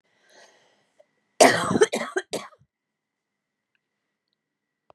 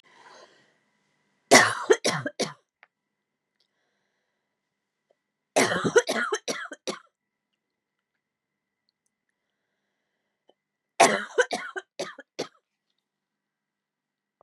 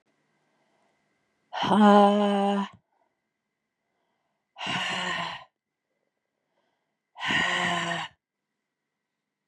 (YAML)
cough_length: 4.9 s
cough_amplitude: 30427
cough_signal_mean_std_ratio: 0.24
three_cough_length: 14.4 s
three_cough_amplitude: 26874
three_cough_signal_mean_std_ratio: 0.25
exhalation_length: 9.5 s
exhalation_amplitude: 17256
exhalation_signal_mean_std_ratio: 0.37
survey_phase: beta (2021-08-13 to 2022-03-07)
age: 45-64
gender: Female
wearing_mask: 'No'
symptom_cough_any: true
symptom_shortness_of_breath: true
symptom_sore_throat: true
symptom_fatigue: true
symptom_headache: true
symptom_other: true
symptom_onset: 3 days
smoker_status: Never smoked
respiratory_condition_asthma: false
respiratory_condition_other: false
recruitment_source: Test and Trace
submission_delay: 1 day
covid_test_result: Positive
covid_test_method: ePCR